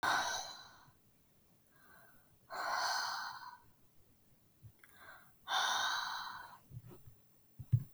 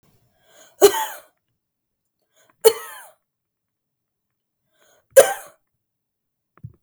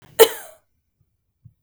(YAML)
exhalation_length: 7.9 s
exhalation_amplitude: 3386
exhalation_signal_mean_std_ratio: 0.5
three_cough_length: 6.8 s
three_cough_amplitude: 32768
three_cough_signal_mean_std_ratio: 0.19
cough_length: 1.6 s
cough_amplitude: 32768
cough_signal_mean_std_ratio: 0.19
survey_phase: beta (2021-08-13 to 2022-03-07)
age: 18-44
gender: Female
wearing_mask: 'No'
symptom_none: true
smoker_status: Never smoked
respiratory_condition_asthma: false
respiratory_condition_other: false
recruitment_source: REACT
submission_delay: 1 day
covid_test_result: Negative
covid_test_method: RT-qPCR